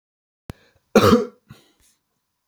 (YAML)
cough_length: 2.5 s
cough_amplitude: 28016
cough_signal_mean_std_ratio: 0.27
survey_phase: beta (2021-08-13 to 2022-03-07)
age: 45-64
gender: Male
wearing_mask: 'No'
symptom_none: true
symptom_onset: 4 days
smoker_status: Never smoked
respiratory_condition_asthma: false
respiratory_condition_other: false
recruitment_source: REACT
submission_delay: 1 day
covid_test_result: Negative
covid_test_method: RT-qPCR
influenza_a_test_result: Negative
influenza_b_test_result: Negative